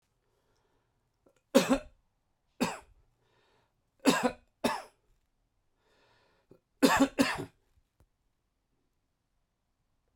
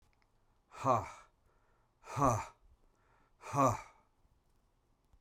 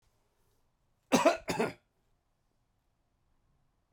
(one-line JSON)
{"three_cough_length": "10.2 s", "three_cough_amplitude": 12894, "three_cough_signal_mean_std_ratio": 0.25, "exhalation_length": "5.2 s", "exhalation_amplitude": 4760, "exhalation_signal_mean_std_ratio": 0.33, "cough_length": "3.9 s", "cough_amplitude": 10587, "cough_signal_mean_std_ratio": 0.25, "survey_phase": "beta (2021-08-13 to 2022-03-07)", "age": "65+", "gender": "Male", "wearing_mask": "No", "symptom_cough_any": true, "symptom_runny_or_blocked_nose": true, "symptom_fatigue": true, "symptom_headache": true, "symptom_change_to_sense_of_smell_or_taste": true, "symptom_loss_of_taste": true, "smoker_status": "Ex-smoker", "respiratory_condition_asthma": false, "respiratory_condition_other": false, "recruitment_source": "Test and Trace", "submission_delay": "1 day", "covid_test_result": "Positive", "covid_test_method": "RT-qPCR", "covid_ct_value": 25.2, "covid_ct_gene": "ORF1ab gene"}